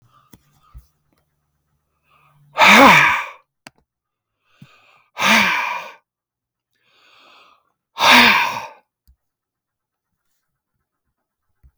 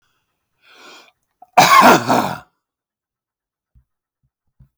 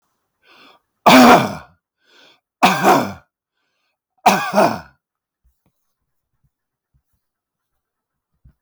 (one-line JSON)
{"exhalation_length": "11.8 s", "exhalation_amplitude": 32768, "exhalation_signal_mean_std_ratio": 0.3, "cough_length": "4.8 s", "cough_amplitude": 32766, "cough_signal_mean_std_ratio": 0.3, "three_cough_length": "8.6 s", "three_cough_amplitude": 32768, "three_cough_signal_mean_std_ratio": 0.3, "survey_phase": "beta (2021-08-13 to 2022-03-07)", "age": "65+", "gender": "Male", "wearing_mask": "No", "symptom_none": true, "smoker_status": "Ex-smoker", "respiratory_condition_asthma": false, "respiratory_condition_other": false, "recruitment_source": "REACT", "submission_delay": "1 day", "covid_test_result": "Negative", "covid_test_method": "RT-qPCR"}